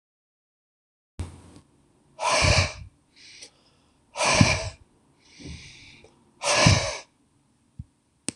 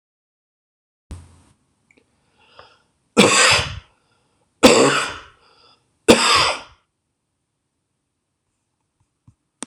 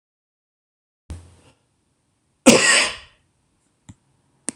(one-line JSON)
{"exhalation_length": "8.4 s", "exhalation_amplitude": 25925, "exhalation_signal_mean_std_ratio": 0.36, "three_cough_length": "9.7 s", "three_cough_amplitude": 26028, "three_cough_signal_mean_std_ratio": 0.3, "cough_length": "4.6 s", "cough_amplitude": 26028, "cough_signal_mean_std_ratio": 0.25, "survey_phase": "beta (2021-08-13 to 2022-03-07)", "age": "65+", "gender": "Male", "wearing_mask": "No", "symptom_none": true, "smoker_status": "Ex-smoker", "respiratory_condition_asthma": false, "respiratory_condition_other": false, "recruitment_source": "REACT", "submission_delay": "1 day", "covid_test_result": "Negative", "covid_test_method": "RT-qPCR"}